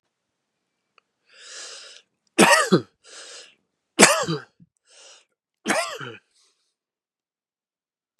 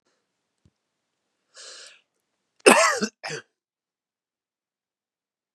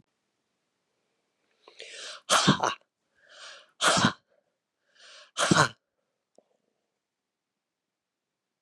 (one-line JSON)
{"three_cough_length": "8.2 s", "three_cough_amplitude": 32768, "three_cough_signal_mean_std_ratio": 0.26, "cough_length": "5.5 s", "cough_amplitude": 32767, "cough_signal_mean_std_ratio": 0.2, "exhalation_length": "8.6 s", "exhalation_amplitude": 15405, "exhalation_signal_mean_std_ratio": 0.27, "survey_phase": "beta (2021-08-13 to 2022-03-07)", "age": "65+", "gender": "Male", "wearing_mask": "No", "symptom_shortness_of_breath": true, "symptom_fatigue": true, "symptom_change_to_sense_of_smell_or_taste": true, "smoker_status": "Never smoked", "respiratory_condition_asthma": true, "respiratory_condition_other": false, "recruitment_source": "REACT", "submission_delay": "2 days", "covid_test_result": "Negative", "covid_test_method": "RT-qPCR"}